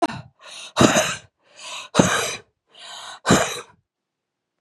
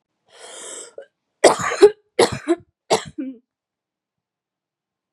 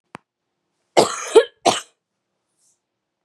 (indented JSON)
{
  "exhalation_length": "4.6 s",
  "exhalation_amplitude": 32768,
  "exhalation_signal_mean_std_ratio": 0.4,
  "three_cough_length": "5.1 s",
  "three_cough_amplitude": 32768,
  "three_cough_signal_mean_std_ratio": 0.28,
  "cough_length": "3.2 s",
  "cough_amplitude": 32636,
  "cough_signal_mean_std_ratio": 0.25,
  "survey_phase": "beta (2021-08-13 to 2022-03-07)",
  "age": "18-44",
  "gender": "Female",
  "wearing_mask": "No",
  "symptom_cough_any": true,
  "symptom_runny_or_blocked_nose": true,
  "symptom_sore_throat": true,
  "symptom_fatigue": true,
  "symptom_fever_high_temperature": true,
  "symptom_headache": true,
  "symptom_change_to_sense_of_smell_or_taste": true,
  "symptom_loss_of_taste": true,
  "symptom_onset": "3 days",
  "smoker_status": "Never smoked",
  "respiratory_condition_asthma": true,
  "respiratory_condition_other": false,
  "recruitment_source": "Test and Trace",
  "submission_delay": "2 days",
  "covid_test_result": "Positive",
  "covid_test_method": "RT-qPCR",
  "covid_ct_value": 15.8,
  "covid_ct_gene": "ORF1ab gene",
  "covid_ct_mean": 16.3,
  "covid_viral_load": "4600000 copies/ml",
  "covid_viral_load_category": "High viral load (>1M copies/ml)"
}